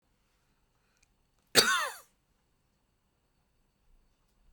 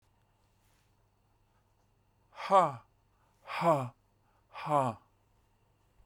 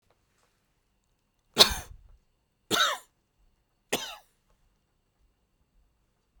{
  "cough_length": "4.5 s",
  "cough_amplitude": 16263,
  "cough_signal_mean_std_ratio": 0.2,
  "exhalation_length": "6.1 s",
  "exhalation_amplitude": 9208,
  "exhalation_signal_mean_std_ratio": 0.3,
  "three_cough_length": "6.4 s",
  "three_cough_amplitude": 32767,
  "three_cough_signal_mean_std_ratio": 0.2,
  "survey_phase": "beta (2021-08-13 to 2022-03-07)",
  "age": "45-64",
  "gender": "Male",
  "wearing_mask": "No",
  "symptom_none": true,
  "smoker_status": "Never smoked",
  "respiratory_condition_asthma": false,
  "respiratory_condition_other": false,
  "recruitment_source": "REACT",
  "submission_delay": "1 day",
  "covid_test_result": "Negative",
  "covid_test_method": "RT-qPCR"
}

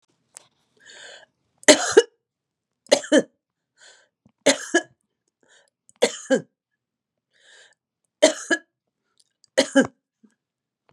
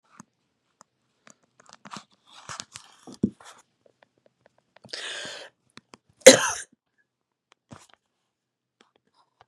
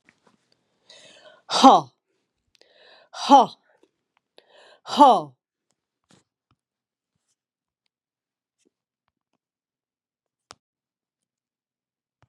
{
  "three_cough_length": "10.9 s",
  "three_cough_amplitude": 32767,
  "three_cough_signal_mean_std_ratio": 0.24,
  "cough_length": "9.5 s",
  "cough_amplitude": 32768,
  "cough_signal_mean_std_ratio": 0.13,
  "exhalation_length": "12.3 s",
  "exhalation_amplitude": 32648,
  "exhalation_signal_mean_std_ratio": 0.19,
  "survey_phase": "beta (2021-08-13 to 2022-03-07)",
  "age": "65+",
  "gender": "Female",
  "wearing_mask": "No",
  "symptom_none": true,
  "smoker_status": "Never smoked",
  "respiratory_condition_asthma": false,
  "respiratory_condition_other": false,
  "recruitment_source": "Test and Trace",
  "submission_delay": "2 days",
  "covid_test_result": "Positive",
  "covid_test_method": "RT-qPCR",
  "covid_ct_value": 16.9,
  "covid_ct_gene": "N gene"
}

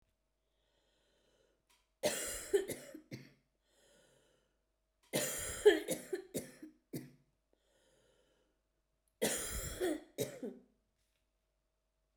{
  "three_cough_length": "12.2 s",
  "three_cough_amplitude": 6765,
  "three_cough_signal_mean_std_ratio": 0.31,
  "survey_phase": "beta (2021-08-13 to 2022-03-07)",
  "age": "45-64",
  "gender": "Female",
  "wearing_mask": "No",
  "symptom_cough_any": true,
  "symptom_fatigue": true,
  "symptom_onset": "4 days",
  "smoker_status": "Never smoked",
  "respiratory_condition_asthma": true,
  "respiratory_condition_other": false,
  "recruitment_source": "REACT",
  "submission_delay": "1 day",
  "covid_test_result": "Negative",
  "covid_test_method": "RT-qPCR",
  "influenza_a_test_result": "Negative",
  "influenza_b_test_result": "Negative"
}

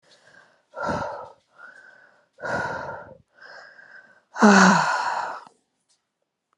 {
  "exhalation_length": "6.6 s",
  "exhalation_amplitude": 28630,
  "exhalation_signal_mean_std_ratio": 0.36,
  "survey_phase": "beta (2021-08-13 to 2022-03-07)",
  "age": "45-64",
  "gender": "Female",
  "wearing_mask": "No",
  "symptom_none": true,
  "smoker_status": "Never smoked",
  "respiratory_condition_asthma": true,
  "respiratory_condition_other": false,
  "recruitment_source": "REACT",
  "submission_delay": "4 days",
  "covid_test_result": "Negative",
  "covid_test_method": "RT-qPCR"
}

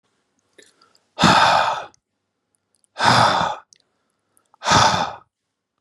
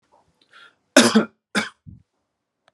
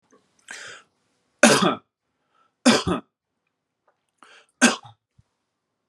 {
  "exhalation_length": "5.8 s",
  "exhalation_amplitude": 32624,
  "exhalation_signal_mean_std_ratio": 0.43,
  "cough_length": "2.7 s",
  "cough_amplitude": 32749,
  "cough_signal_mean_std_ratio": 0.27,
  "three_cough_length": "5.9 s",
  "three_cough_amplitude": 32767,
  "three_cough_signal_mean_std_ratio": 0.27,
  "survey_phase": "beta (2021-08-13 to 2022-03-07)",
  "age": "45-64",
  "gender": "Male",
  "wearing_mask": "No",
  "symptom_none": true,
  "smoker_status": "Never smoked",
  "respiratory_condition_asthma": false,
  "respiratory_condition_other": false,
  "recruitment_source": "REACT",
  "submission_delay": "2 days",
  "covid_test_result": "Negative",
  "covid_test_method": "RT-qPCR",
  "influenza_a_test_result": "Negative",
  "influenza_b_test_result": "Negative"
}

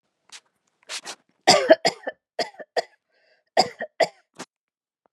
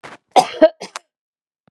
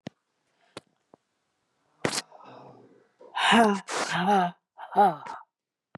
{
  "three_cough_length": "5.1 s",
  "three_cough_amplitude": 30655,
  "three_cough_signal_mean_std_ratio": 0.27,
  "cough_length": "1.7 s",
  "cough_amplitude": 32768,
  "cough_signal_mean_std_ratio": 0.27,
  "exhalation_length": "6.0 s",
  "exhalation_amplitude": 16288,
  "exhalation_signal_mean_std_ratio": 0.39,
  "survey_phase": "beta (2021-08-13 to 2022-03-07)",
  "age": "45-64",
  "gender": "Female",
  "wearing_mask": "No",
  "symptom_none": true,
  "smoker_status": "Ex-smoker",
  "respiratory_condition_asthma": false,
  "respiratory_condition_other": false,
  "recruitment_source": "REACT",
  "submission_delay": "3 days",
  "covid_test_result": "Negative",
  "covid_test_method": "RT-qPCR",
  "influenza_a_test_result": "Negative",
  "influenza_b_test_result": "Negative"
}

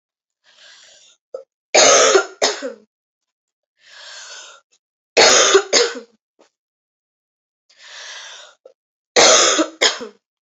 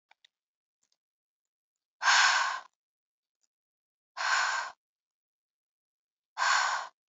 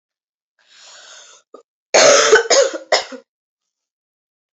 {
  "three_cough_length": "10.4 s",
  "three_cough_amplitude": 32768,
  "three_cough_signal_mean_std_ratio": 0.37,
  "exhalation_length": "7.1 s",
  "exhalation_amplitude": 10432,
  "exhalation_signal_mean_std_ratio": 0.36,
  "cough_length": "4.5 s",
  "cough_amplitude": 32184,
  "cough_signal_mean_std_ratio": 0.36,
  "survey_phase": "alpha (2021-03-01 to 2021-08-12)",
  "age": "18-44",
  "gender": "Female",
  "wearing_mask": "No",
  "symptom_cough_any": true,
  "symptom_headache": true,
  "smoker_status": "Never smoked",
  "respiratory_condition_asthma": false,
  "respiratory_condition_other": false,
  "recruitment_source": "Test and Trace",
  "submission_delay": "2 days",
  "covid_test_result": "Positive",
  "covid_test_method": "RT-qPCR"
}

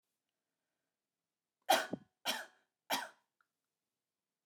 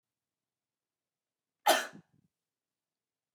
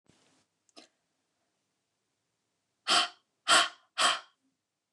{
  "three_cough_length": "4.5 s",
  "three_cough_amplitude": 5409,
  "three_cough_signal_mean_std_ratio": 0.23,
  "cough_length": "3.3 s",
  "cough_amplitude": 8453,
  "cough_signal_mean_std_ratio": 0.17,
  "exhalation_length": "4.9 s",
  "exhalation_amplitude": 10690,
  "exhalation_signal_mean_std_ratio": 0.27,
  "survey_phase": "alpha (2021-03-01 to 2021-08-12)",
  "age": "18-44",
  "gender": "Female",
  "wearing_mask": "No",
  "symptom_none": true,
  "smoker_status": "Never smoked",
  "respiratory_condition_asthma": false,
  "respiratory_condition_other": false,
  "recruitment_source": "REACT",
  "submission_delay": "2 days",
  "covid_test_result": "Negative",
  "covid_test_method": "RT-qPCR"
}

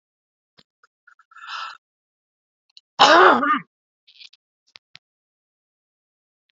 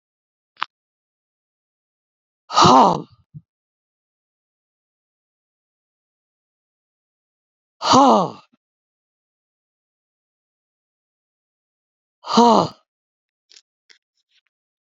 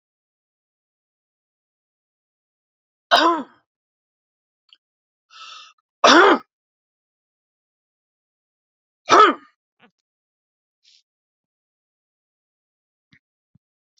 {
  "cough_length": "6.6 s",
  "cough_amplitude": 29706,
  "cough_signal_mean_std_ratio": 0.24,
  "exhalation_length": "14.8 s",
  "exhalation_amplitude": 31160,
  "exhalation_signal_mean_std_ratio": 0.21,
  "three_cough_length": "14.0 s",
  "three_cough_amplitude": 29444,
  "three_cough_signal_mean_std_ratio": 0.19,
  "survey_phase": "beta (2021-08-13 to 2022-03-07)",
  "age": "65+",
  "gender": "Male",
  "wearing_mask": "No",
  "symptom_none": true,
  "smoker_status": "Ex-smoker",
  "respiratory_condition_asthma": false,
  "respiratory_condition_other": false,
  "recruitment_source": "REACT",
  "submission_delay": "2 days",
  "covid_test_result": "Negative",
  "covid_test_method": "RT-qPCR",
  "influenza_a_test_result": "Negative",
  "influenza_b_test_result": "Negative"
}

